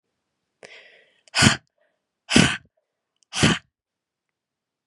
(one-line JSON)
{"exhalation_length": "4.9 s", "exhalation_amplitude": 32305, "exhalation_signal_mean_std_ratio": 0.27, "survey_phase": "beta (2021-08-13 to 2022-03-07)", "age": "18-44", "gender": "Female", "wearing_mask": "No", "symptom_runny_or_blocked_nose": true, "symptom_headache": true, "symptom_onset": "3 days", "smoker_status": "Never smoked", "respiratory_condition_asthma": false, "respiratory_condition_other": false, "recruitment_source": "Test and Trace", "submission_delay": "1 day", "covid_test_result": "Positive", "covid_test_method": "RT-qPCR", "covid_ct_value": 29.2, "covid_ct_gene": "N gene"}